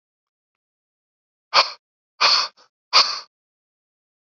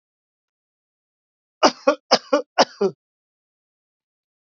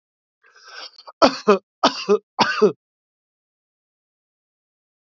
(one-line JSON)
{"exhalation_length": "4.3 s", "exhalation_amplitude": 29682, "exhalation_signal_mean_std_ratio": 0.28, "cough_length": "4.5 s", "cough_amplitude": 29376, "cough_signal_mean_std_ratio": 0.24, "three_cough_length": "5.0 s", "three_cough_amplitude": 28497, "three_cough_signal_mean_std_ratio": 0.29, "survey_phase": "beta (2021-08-13 to 2022-03-07)", "age": "45-64", "gender": "Male", "wearing_mask": "No", "symptom_runny_or_blocked_nose": true, "smoker_status": "Ex-smoker", "respiratory_condition_asthma": false, "respiratory_condition_other": false, "recruitment_source": "REACT", "submission_delay": "1 day", "covid_test_result": "Negative", "covid_test_method": "RT-qPCR", "influenza_a_test_result": "Negative", "influenza_b_test_result": "Negative"}